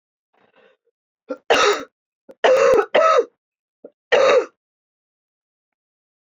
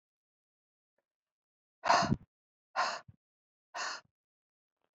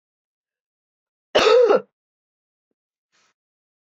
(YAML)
three_cough_length: 6.3 s
three_cough_amplitude: 23693
three_cough_signal_mean_std_ratio: 0.4
exhalation_length: 4.9 s
exhalation_amplitude: 7902
exhalation_signal_mean_std_ratio: 0.27
cough_length: 3.8 s
cough_amplitude: 24829
cough_signal_mean_std_ratio: 0.28
survey_phase: beta (2021-08-13 to 2022-03-07)
age: 45-64
gender: Female
wearing_mask: 'No'
symptom_cough_any: true
symptom_runny_or_blocked_nose: true
symptom_headache: true
symptom_change_to_sense_of_smell_or_taste: true
symptom_loss_of_taste: true
symptom_onset: 4 days
smoker_status: Never smoked
respiratory_condition_asthma: true
respiratory_condition_other: false
recruitment_source: Test and Trace
submission_delay: 1 day
covid_test_result: Positive
covid_test_method: ePCR